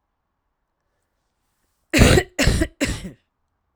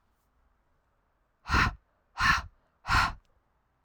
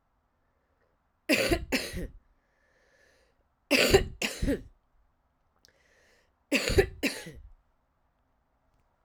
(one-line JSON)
{"cough_length": "3.8 s", "cough_amplitude": 32767, "cough_signal_mean_std_ratio": 0.34, "exhalation_length": "3.8 s", "exhalation_amplitude": 9267, "exhalation_signal_mean_std_ratio": 0.35, "three_cough_length": "9.0 s", "three_cough_amplitude": 16271, "three_cough_signal_mean_std_ratio": 0.33, "survey_phase": "beta (2021-08-13 to 2022-03-07)", "age": "18-44", "gender": "Female", "wearing_mask": "No", "symptom_cough_any": true, "symptom_new_continuous_cough": true, "symptom_runny_or_blocked_nose": true, "symptom_shortness_of_breath": true, "symptom_sore_throat": true, "symptom_abdominal_pain": true, "symptom_fatigue": true, "symptom_headache": true, "symptom_change_to_sense_of_smell_or_taste": true, "symptom_onset": "2 days", "smoker_status": "Ex-smoker", "respiratory_condition_asthma": false, "respiratory_condition_other": false, "recruitment_source": "Test and Trace", "submission_delay": "1 day", "covid_test_result": "Positive", "covid_test_method": "RT-qPCR"}